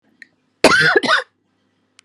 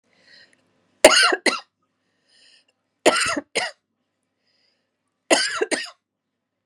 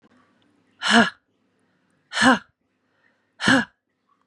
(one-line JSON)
{"cough_length": "2.0 s", "cough_amplitude": 32768, "cough_signal_mean_std_ratio": 0.42, "three_cough_length": "6.7 s", "three_cough_amplitude": 32768, "three_cough_signal_mean_std_ratio": 0.3, "exhalation_length": "4.3 s", "exhalation_amplitude": 25496, "exhalation_signal_mean_std_ratio": 0.31, "survey_phase": "beta (2021-08-13 to 2022-03-07)", "age": "45-64", "gender": "Female", "wearing_mask": "No", "symptom_runny_or_blocked_nose": true, "symptom_diarrhoea": true, "symptom_headache": true, "symptom_onset": "13 days", "smoker_status": "Ex-smoker", "respiratory_condition_asthma": false, "respiratory_condition_other": false, "recruitment_source": "REACT", "submission_delay": "2 days", "covid_test_result": "Negative", "covid_test_method": "RT-qPCR", "influenza_a_test_result": "Negative", "influenza_b_test_result": "Negative"}